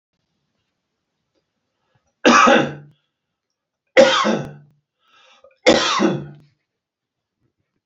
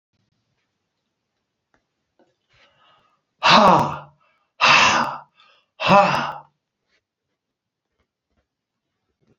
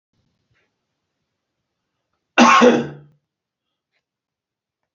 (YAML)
three_cough_length: 7.9 s
three_cough_amplitude: 31054
three_cough_signal_mean_std_ratio: 0.33
exhalation_length: 9.4 s
exhalation_amplitude: 27994
exhalation_signal_mean_std_ratio: 0.3
cough_length: 4.9 s
cough_amplitude: 28405
cough_signal_mean_std_ratio: 0.25
survey_phase: beta (2021-08-13 to 2022-03-07)
age: 65+
gender: Male
wearing_mask: 'No'
symptom_none: true
smoker_status: Never smoked
respiratory_condition_asthma: false
respiratory_condition_other: false
recruitment_source: REACT
submission_delay: 1 day
covid_test_result: Negative
covid_test_method: RT-qPCR
influenza_a_test_result: Negative
influenza_b_test_result: Negative